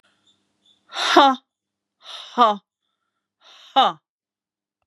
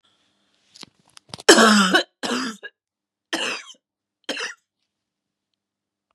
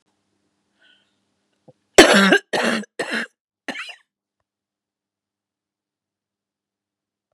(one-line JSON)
{"exhalation_length": "4.9 s", "exhalation_amplitude": 32054, "exhalation_signal_mean_std_ratio": 0.3, "three_cough_length": "6.1 s", "three_cough_amplitude": 32768, "three_cough_signal_mean_std_ratio": 0.3, "cough_length": "7.3 s", "cough_amplitude": 32768, "cough_signal_mean_std_ratio": 0.24, "survey_phase": "beta (2021-08-13 to 2022-03-07)", "age": "45-64", "gender": "Female", "wearing_mask": "No", "symptom_cough_any": true, "symptom_runny_or_blocked_nose": true, "symptom_onset": "5 days", "smoker_status": "Never smoked", "respiratory_condition_asthma": false, "respiratory_condition_other": false, "recruitment_source": "Test and Trace", "submission_delay": "4 days", "covid_test_result": "Negative", "covid_test_method": "RT-qPCR"}